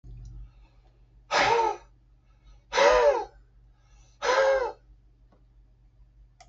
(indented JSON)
{
  "exhalation_length": "6.5 s",
  "exhalation_amplitude": 13042,
  "exhalation_signal_mean_std_ratio": 0.42,
  "survey_phase": "beta (2021-08-13 to 2022-03-07)",
  "age": "65+",
  "gender": "Male",
  "wearing_mask": "No",
  "symptom_none": true,
  "smoker_status": "Ex-smoker",
  "respiratory_condition_asthma": false,
  "respiratory_condition_other": true,
  "recruitment_source": "REACT",
  "submission_delay": "4 days",
  "covid_test_result": "Negative",
  "covid_test_method": "RT-qPCR",
  "influenza_a_test_result": "Negative",
  "influenza_b_test_result": "Negative"
}